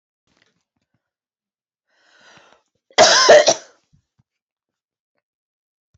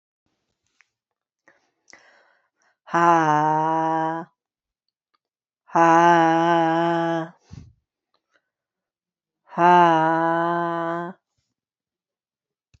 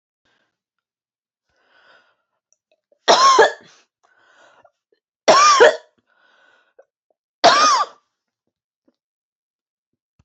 {"cough_length": "6.0 s", "cough_amplitude": 29319, "cough_signal_mean_std_ratio": 0.24, "exhalation_length": "12.8 s", "exhalation_amplitude": 23293, "exhalation_signal_mean_std_ratio": 0.43, "three_cough_length": "10.2 s", "three_cough_amplitude": 29508, "three_cough_signal_mean_std_ratio": 0.3, "survey_phase": "beta (2021-08-13 to 2022-03-07)", "age": "18-44", "gender": "Female", "wearing_mask": "No", "symptom_cough_any": true, "smoker_status": "Ex-smoker", "respiratory_condition_asthma": false, "respiratory_condition_other": false, "recruitment_source": "REACT", "submission_delay": "2 days", "covid_test_result": "Negative", "covid_test_method": "RT-qPCR"}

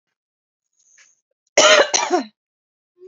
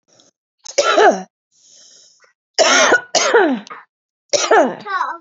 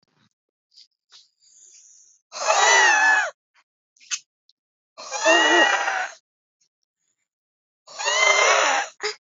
{"cough_length": "3.1 s", "cough_amplitude": 32768, "cough_signal_mean_std_ratio": 0.33, "three_cough_length": "5.2 s", "three_cough_amplitude": 32768, "three_cough_signal_mean_std_ratio": 0.51, "exhalation_length": "9.2 s", "exhalation_amplitude": 23815, "exhalation_signal_mean_std_ratio": 0.46, "survey_phase": "beta (2021-08-13 to 2022-03-07)", "age": "18-44", "gender": "Female", "wearing_mask": "No", "symptom_none": true, "smoker_status": "Never smoked", "respiratory_condition_asthma": false, "respiratory_condition_other": false, "recruitment_source": "Test and Trace", "submission_delay": "0 days", "covid_test_method": "ePCR"}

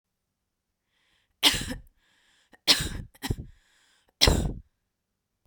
{"three_cough_length": "5.5 s", "three_cough_amplitude": 24152, "three_cough_signal_mean_std_ratio": 0.3, "survey_phase": "beta (2021-08-13 to 2022-03-07)", "age": "18-44", "gender": "Female", "wearing_mask": "No", "symptom_sore_throat": true, "symptom_onset": "2 days", "smoker_status": "Never smoked", "respiratory_condition_asthma": false, "respiratory_condition_other": false, "recruitment_source": "Test and Trace", "submission_delay": "1 day", "covid_test_result": "Positive", "covid_test_method": "RT-qPCR", "covid_ct_value": 25.5, "covid_ct_gene": "ORF1ab gene", "covid_ct_mean": 28.8, "covid_viral_load": "360 copies/ml", "covid_viral_load_category": "Minimal viral load (< 10K copies/ml)"}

